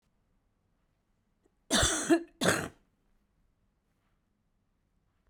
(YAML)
cough_length: 5.3 s
cough_amplitude: 12151
cough_signal_mean_std_ratio: 0.29
survey_phase: beta (2021-08-13 to 2022-03-07)
age: 45-64
gender: Female
wearing_mask: 'No'
symptom_cough_any: true
symptom_new_continuous_cough: true
symptom_runny_or_blocked_nose: true
symptom_sore_throat: true
symptom_fatigue: true
symptom_headache: true
symptom_onset: 2 days
smoker_status: Ex-smoker
respiratory_condition_asthma: false
respiratory_condition_other: false
recruitment_source: Test and Trace
submission_delay: 1 day
covid_test_result: Positive
covid_test_method: ePCR